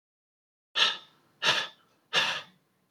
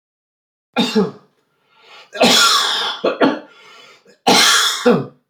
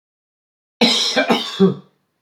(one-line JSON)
{"exhalation_length": "2.9 s", "exhalation_amplitude": 11342, "exhalation_signal_mean_std_ratio": 0.39, "three_cough_length": "5.3 s", "three_cough_amplitude": 32767, "three_cough_signal_mean_std_ratio": 0.54, "cough_length": "2.2 s", "cough_amplitude": 26566, "cough_signal_mean_std_ratio": 0.49, "survey_phase": "beta (2021-08-13 to 2022-03-07)", "age": "45-64", "gender": "Male", "wearing_mask": "No", "symptom_none": true, "symptom_onset": "13 days", "smoker_status": "Never smoked", "respiratory_condition_asthma": true, "respiratory_condition_other": false, "recruitment_source": "REACT", "submission_delay": "3 days", "covid_test_result": "Negative", "covid_test_method": "RT-qPCR"}